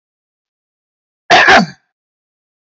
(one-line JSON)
{"cough_length": "2.7 s", "cough_amplitude": 29661, "cough_signal_mean_std_ratio": 0.32, "survey_phase": "alpha (2021-03-01 to 2021-08-12)", "age": "45-64", "gender": "Male", "wearing_mask": "No", "symptom_none": true, "smoker_status": "Current smoker (11 or more cigarettes per day)", "respiratory_condition_asthma": false, "respiratory_condition_other": false, "recruitment_source": "REACT", "submission_delay": "1 day", "covid_test_result": "Negative", "covid_test_method": "RT-qPCR"}